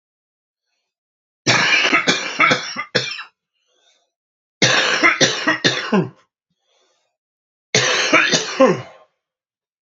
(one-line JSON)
{"three_cough_length": "9.8 s", "three_cough_amplitude": 32767, "three_cough_signal_mean_std_ratio": 0.49, "survey_phase": "beta (2021-08-13 to 2022-03-07)", "age": "18-44", "gender": "Male", "wearing_mask": "Yes", "symptom_cough_any": true, "symptom_headache": true, "symptom_change_to_sense_of_smell_or_taste": true, "symptom_other": true, "symptom_onset": "3 days", "smoker_status": "Current smoker (1 to 10 cigarettes per day)", "respiratory_condition_asthma": false, "respiratory_condition_other": false, "recruitment_source": "Test and Trace", "submission_delay": "1 day", "covid_test_result": "Positive", "covid_test_method": "RT-qPCR", "covid_ct_value": 18.1, "covid_ct_gene": "ORF1ab gene", "covid_ct_mean": 18.4, "covid_viral_load": "930000 copies/ml", "covid_viral_load_category": "Low viral load (10K-1M copies/ml)"}